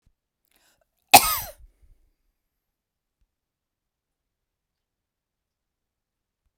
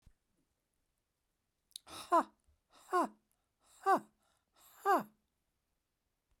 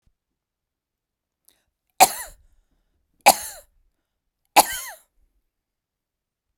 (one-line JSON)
{"cough_length": "6.6 s", "cough_amplitude": 32768, "cough_signal_mean_std_ratio": 0.12, "exhalation_length": "6.4 s", "exhalation_amplitude": 3880, "exhalation_signal_mean_std_ratio": 0.26, "three_cough_length": "6.6 s", "three_cough_amplitude": 32768, "three_cough_signal_mean_std_ratio": 0.17, "survey_phase": "beta (2021-08-13 to 2022-03-07)", "age": "65+", "gender": "Female", "wearing_mask": "No", "symptom_none": true, "smoker_status": "Ex-smoker", "respiratory_condition_asthma": false, "respiratory_condition_other": false, "recruitment_source": "REACT", "submission_delay": "2 days", "covid_test_result": "Negative", "covid_test_method": "RT-qPCR"}